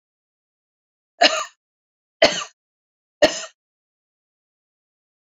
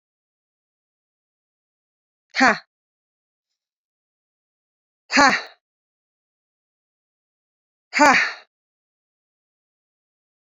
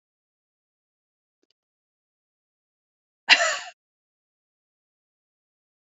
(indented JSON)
{
  "three_cough_length": "5.3 s",
  "three_cough_amplitude": 30229,
  "three_cough_signal_mean_std_ratio": 0.22,
  "exhalation_length": "10.4 s",
  "exhalation_amplitude": 28628,
  "exhalation_signal_mean_std_ratio": 0.2,
  "cough_length": "5.9 s",
  "cough_amplitude": 27604,
  "cough_signal_mean_std_ratio": 0.15,
  "survey_phase": "beta (2021-08-13 to 2022-03-07)",
  "age": "45-64",
  "gender": "Female",
  "wearing_mask": "No",
  "symptom_none": true,
  "smoker_status": "Ex-smoker",
  "respiratory_condition_asthma": false,
  "respiratory_condition_other": false,
  "recruitment_source": "REACT",
  "submission_delay": "1 day",
  "covid_test_result": "Negative",
  "covid_test_method": "RT-qPCR",
  "influenza_a_test_result": "Negative",
  "influenza_b_test_result": "Negative"
}